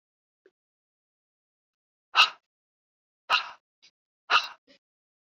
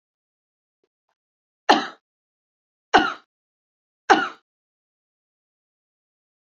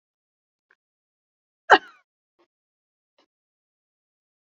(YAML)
exhalation_length: 5.4 s
exhalation_amplitude: 17476
exhalation_signal_mean_std_ratio: 0.2
three_cough_length: 6.6 s
three_cough_amplitude: 27743
three_cough_signal_mean_std_ratio: 0.19
cough_length: 4.5 s
cough_amplitude: 29603
cough_signal_mean_std_ratio: 0.1
survey_phase: beta (2021-08-13 to 2022-03-07)
age: 65+
gender: Female
wearing_mask: 'No'
symptom_none: true
smoker_status: Never smoked
respiratory_condition_asthma: false
respiratory_condition_other: false
recruitment_source: REACT
submission_delay: 1 day
covid_test_result: Negative
covid_test_method: RT-qPCR